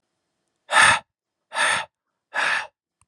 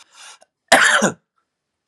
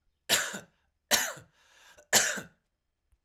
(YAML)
exhalation_length: 3.1 s
exhalation_amplitude: 23656
exhalation_signal_mean_std_ratio: 0.4
cough_length: 1.9 s
cough_amplitude: 32768
cough_signal_mean_std_ratio: 0.37
three_cough_length: 3.2 s
three_cough_amplitude: 14084
three_cough_signal_mean_std_ratio: 0.35
survey_phase: alpha (2021-03-01 to 2021-08-12)
age: 18-44
gender: Male
wearing_mask: 'No'
symptom_none: true
smoker_status: Current smoker (e-cigarettes or vapes only)
respiratory_condition_asthma: false
respiratory_condition_other: false
recruitment_source: REACT
submission_delay: 2 days
covid_test_result: Negative
covid_test_method: RT-qPCR